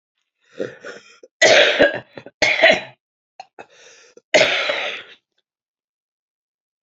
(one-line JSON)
{"three_cough_length": "6.8 s", "three_cough_amplitude": 29763, "three_cough_signal_mean_std_ratio": 0.37, "survey_phase": "beta (2021-08-13 to 2022-03-07)", "age": "45-64", "gender": "Female", "wearing_mask": "No", "symptom_cough_any": true, "symptom_new_continuous_cough": true, "symptom_runny_or_blocked_nose": true, "symptom_sore_throat": true, "symptom_headache": true, "symptom_change_to_sense_of_smell_or_taste": true, "symptom_loss_of_taste": true, "symptom_onset": "4 days", "smoker_status": "Never smoked", "respiratory_condition_asthma": false, "respiratory_condition_other": false, "recruitment_source": "Test and Trace", "submission_delay": "2 days", "covid_test_result": "Positive", "covid_test_method": "RT-qPCR"}